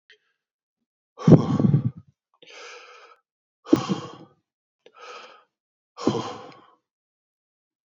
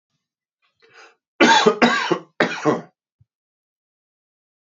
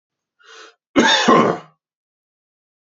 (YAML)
exhalation_length: 7.9 s
exhalation_amplitude: 27999
exhalation_signal_mean_std_ratio: 0.26
three_cough_length: 4.6 s
three_cough_amplitude: 32767
three_cough_signal_mean_std_ratio: 0.35
cough_length: 2.9 s
cough_amplitude: 32767
cough_signal_mean_std_ratio: 0.37
survey_phase: beta (2021-08-13 to 2022-03-07)
age: 45-64
gender: Male
wearing_mask: 'No'
symptom_cough_any: true
symptom_runny_or_blocked_nose: true
symptom_sore_throat: true
symptom_headache: true
symptom_onset: 3 days
smoker_status: Ex-smoker
respiratory_condition_asthma: false
respiratory_condition_other: false
recruitment_source: Test and Trace
submission_delay: 2 days
covid_test_result: Positive
covid_test_method: RT-qPCR
covid_ct_value: 17.8
covid_ct_gene: ORF1ab gene